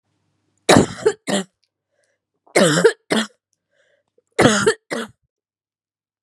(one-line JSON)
{"three_cough_length": "6.2 s", "three_cough_amplitude": 32768, "three_cough_signal_mean_std_ratio": 0.35, "survey_phase": "beta (2021-08-13 to 2022-03-07)", "age": "18-44", "gender": "Female", "wearing_mask": "No", "symptom_runny_or_blocked_nose": true, "symptom_fatigue": true, "symptom_headache": true, "smoker_status": "Never smoked", "respiratory_condition_asthma": false, "respiratory_condition_other": false, "recruitment_source": "Test and Trace", "submission_delay": "2 days", "covid_test_result": "Positive", "covid_test_method": "RT-qPCR"}